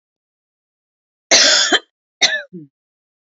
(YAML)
cough_length: 3.3 s
cough_amplitude: 31531
cough_signal_mean_std_ratio: 0.35
survey_phase: beta (2021-08-13 to 2022-03-07)
age: 45-64
gender: Female
wearing_mask: 'No'
symptom_cough_any: true
smoker_status: Current smoker (e-cigarettes or vapes only)
respiratory_condition_asthma: false
respiratory_condition_other: false
recruitment_source: REACT
submission_delay: 2 days
covid_test_result: Negative
covid_test_method: RT-qPCR
influenza_a_test_result: Negative
influenza_b_test_result: Negative